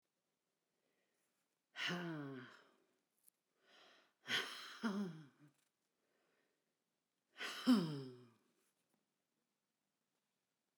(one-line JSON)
{"exhalation_length": "10.8 s", "exhalation_amplitude": 2465, "exhalation_signal_mean_std_ratio": 0.3, "survey_phase": "beta (2021-08-13 to 2022-03-07)", "age": "65+", "gender": "Female", "wearing_mask": "No", "symptom_none": true, "smoker_status": "Never smoked", "respiratory_condition_asthma": false, "respiratory_condition_other": false, "recruitment_source": "REACT", "submission_delay": "3 days", "covid_test_result": "Negative", "covid_test_method": "RT-qPCR"}